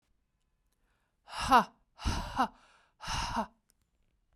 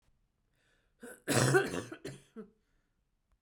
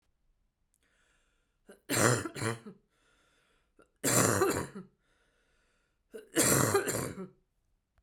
{"exhalation_length": "4.4 s", "exhalation_amplitude": 10364, "exhalation_signal_mean_std_ratio": 0.33, "cough_length": "3.4 s", "cough_amplitude": 7617, "cough_signal_mean_std_ratio": 0.33, "three_cough_length": "8.0 s", "three_cough_amplitude": 11291, "three_cough_signal_mean_std_ratio": 0.39, "survey_phase": "beta (2021-08-13 to 2022-03-07)", "age": "18-44", "gender": "Female", "wearing_mask": "No", "symptom_cough_any": true, "symptom_runny_or_blocked_nose": true, "symptom_sore_throat": true, "symptom_onset": "4 days", "smoker_status": "Never smoked", "respiratory_condition_asthma": false, "respiratory_condition_other": false, "recruitment_source": "Test and Trace", "submission_delay": "2 days", "covid_test_result": "Negative", "covid_test_method": "RT-qPCR"}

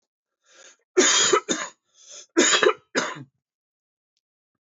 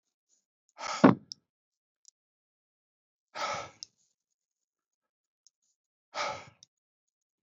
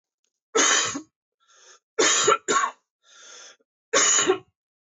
{"cough_length": "4.8 s", "cough_amplitude": 17165, "cough_signal_mean_std_ratio": 0.39, "exhalation_length": "7.4 s", "exhalation_amplitude": 17584, "exhalation_signal_mean_std_ratio": 0.17, "three_cough_length": "4.9 s", "three_cough_amplitude": 16551, "three_cough_signal_mean_std_ratio": 0.46, "survey_phase": "beta (2021-08-13 to 2022-03-07)", "age": "45-64", "gender": "Male", "wearing_mask": "No", "symptom_cough_any": true, "symptom_runny_or_blocked_nose": true, "symptom_shortness_of_breath": true, "symptom_fatigue": true, "symptom_onset": "4 days", "smoker_status": "Never smoked", "respiratory_condition_asthma": false, "respiratory_condition_other": false, "recruitment_source": "Test and Trace", "submission_delay": "1 day", "covid_test_result": "Positive", "covid_test_method": "RT-qPCR", "covid_ct_value": 23.4, "covid_ct_gene": "ORF1ab gene"}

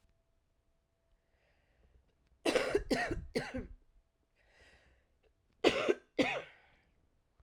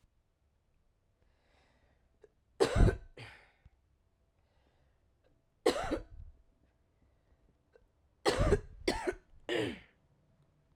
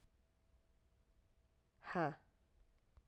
{"cough_length": "7.4 s", "cough_amplitude": 8448, "cough_signal_mean_std_ratio": 0.34, "three_cough_length": "10.8 s", "three_cough_amplitude": 6782, "three_cough_signal_mean_std_ratio": 0.29, "exhalation_length": "3.1 s", "exhalation_amplitude": 1640, "exhalation_signal_mean_std_ratio": 0.26, "survey_phase": "alpha (2021-03-01 to 2021-08-12)", "age": "18-44", "gender": "Female", "wearing_mask": "No", "symptom_cough_any": true, "symptom_shortness_of_breath": true, "symptom_fatigue": true, "smoker_status": "Current smoker (e-cigarettes or vapes only)", "respiratory_condition_asthma": true, "respiratory_condition_other": false, "recruitment_source": "Test and Trace", "submission_delay": "1 day", "covid_test_result": "Positive", "covid_test_method": "RT-qPCR", "covid_ct_value": 21.6, "covid_ct_gene": "ORF1ab gene"}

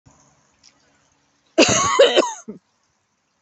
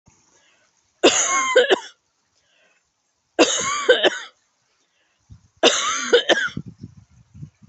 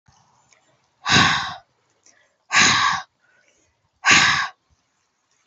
{"cough_length": "3.4 s", "cough_amplitude": 29617, "cough_signal_mean_std_ratio": 0.36, "three_cough_length": "7.7 s", "three_cough_amplitude": 29738, "three_cough_signal_mean_std_ratio": 0.41, "exhalation_length": "5.5 s", "exhalation_amplitude": 27668, "exhalation_signal_mean_std_ratio": 0.4, "survey_phase": "beta (2021-08-13 to 2022-03-07)", "age": "45-64", "gender": "Female", "wearing_mask": "No", "symptom_cough_any": true, "symptom_runny_or_blocked_nose": true, "symptom_fatigue": true, "symptom_onset": "12 days", "smoker_status": "Ex-smoker", "respiratory_condition_asthma": false, "respiratory_condition_other": false, "recruitment_source": "REACT", "submission_delay": "4 days", "covid_test_result": "Negative", "covid_test_method": "RT-qPCR"}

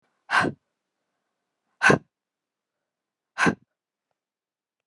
{"exhalation_length": "4.9 s", "exhalation_amplitude": 23110, "exhalation_signal_mean_std_ratio": 0.24, "survey_phase": "beta (2021-08-13 to 2022-03-07)", "age": "18-44", "gender": "Female", "wearing_mask": "No", "symptom_cough_any": true, "symptom_new_continuous_cough": true, "symptom_runny_or_blocked_nose": true, "symptom_fever_high_temperature": true, "smoker_status": "Current smoker (1 to 10 cigarettes per day)", "respiratory_condition_asthma": false, "respiratory_condition_other": false, "recruitment_source": "Test and Trace", "submission_delay": "1 day", "covid_test_result": "Positive", "covid_test_method": "RT-qPCR", "covid_ct_value": 14.8, "covid_ct_gene": "ORF1ab gene", "covid_ct_mean": 15.3, "covid_viral_load": "9600000 copies/ml", "covid_viral_load_category": "High viral load (>1M copies/ml)"}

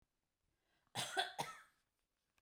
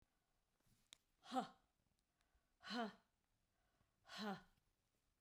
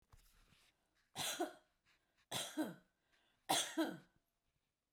{"cough_length": "2.4 s", "cough_amplitude": 2225, "cough_signal_mean_std_ratio": 0.34, "exhalation_length": "5.2 s", "exhalation_amplitude": 963, "exhalation_signal_mean_std_ratio": 0.3, "three_cough_length": "4.9 s", "three_cough_amplitude": 2100, "three_cough_signal_mean_std_ratio": 0.37, "survey_phase": "beta (2021-08-13 to 2022-03-07)", "age": "45-64", "gender": "Female", "wearing_mask": "No", "symptom_abdominal_pain": true, "symptom_diarrhoea": true, "smoker_status": "Never smoked", "respiratory_condition_asthma": false, "respiratory_condition_other": false, "recruitment_source": "REACT", "submission_delay": "11 days", "covid_test_result": "Negative", "covid_test_method": "RT-qPCR"}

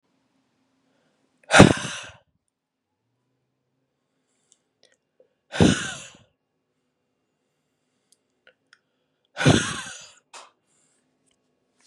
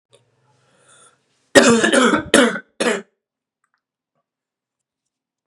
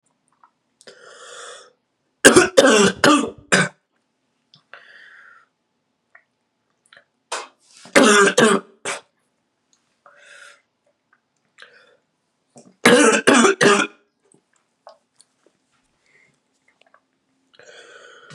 {"exhalation_length": "11.9 s", "exhalation_amplitude": 32768, "exhalation_signal_mean_std_ratio": 0.19, "cough_length": "5.5 s", "cough_amplitude": 32768, "cough_signal_mean_std_ratio": 0.34, "three_cough_length": "18.3 s", "three_cough_amplitude": 32768, "three_cough_signal_mean_std_ratio": 0.3, "survey_phase": "beta (2021-08-13 to 2022-03-07)", "age": "18-44", "gender": "Male", "wearing_mask": "No", "symptom_cough_any": true, "symptom_sore_throat": true, "symptom_change_to_sense_of_smell_or_taste": true, "symptom_onset": "3 days", "smoker_status": "Never smoked", "respiratory_condition_asthma": false, "respiratory_condition_other": false, "recruitment_source": "Test and Trace", "submission_delay": "1 day", "covid_test_result": "Positive", "covid_test_method": "RT-qPCR", "covid_ct_value": 24.0, "covid_ct_gene": "N gene", "covid_ct_mean": 24.4, "covid_viral_load": "10000 copies/ml", "covid_viral_load_category": "Low viral load (10K-1M copies/ml)"}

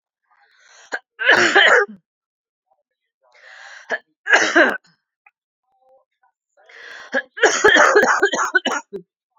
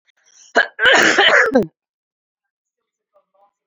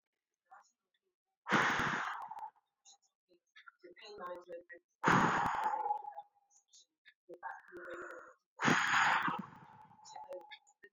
{"three_cough_length": "9.4 s", "three_cough_amplitude": 32767, "three_cough_signal_mean_std_ratio": 0.41, "cough_length": "3.7 s", "cough_amplitude": 32767, "cough_signal_mean_std_ratio": 0.42, "exhalation_length": "10.9 s", "exhalation_amplitude": 6623, "exhalation_signal_mean_std_ratio": 0.45, "survey_phase": "beta (2021-08-13 to 2022-03-07)", "age": "18-44", "gender": "Female", "wearing_mask": "No", "symptom_runny_or_blocked_nose": true, "symptom_shortness_of_breath": true, "symptom_diarrhoea": true, "symptom_other": true, "smoker_status": "Never smoked", "respiratory_condition_asthma": false, "respiratory_condition_other": false, "recruitment_source": "Test and Trace", "submission_delay": "1 day", "covid_test_result": "Positive", "covid_test_method": "RT-qPCR", "covid_ct_value": 25.4, "covid_ct_gene": "ORF1ab gene", "covid_ct_mean": 26.5, "covid_viral_load": "2000 copies/ml", "covid_viral_load_category": "Minimal viral load (< 10K copies/ml)"}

